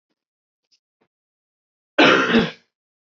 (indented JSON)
{
  "cough_length": "3.2 s",
  "cough_amplitude": 25605,
  "cough_signal_mean_std_ratio": 0.31,
  "survey_phase": "alpha (2021-03-01 to 2021-08-12)",
  "age": "18-44",
  "gender": "Male",
  "wearing_mask": "No",
  "symptom_cough_any": true,
  "symptom_fever_high_temperature": true,
  "symptom_onset": "2 days",
  "smoker_status": "Never smoked",
  "respiratory_condition_asthma": false,
  "respiratory_condition_other": false,
  "recruitment_source": "Test and Trace",
  "submission_delay": "2 days",
  "covid_test_result": "Positive",
  "covid_test_method": "RT-qPCR",
  "covid_ct_value": 16.5,
  "covid_ct_gene": "ORF1ab gene",
  "covid_ct_mean": 17.8,
  "covid_viral_load": "1500000 copies/ml",
  "covid_viral_load_category": "High viral load (>1M copies/ml)"
}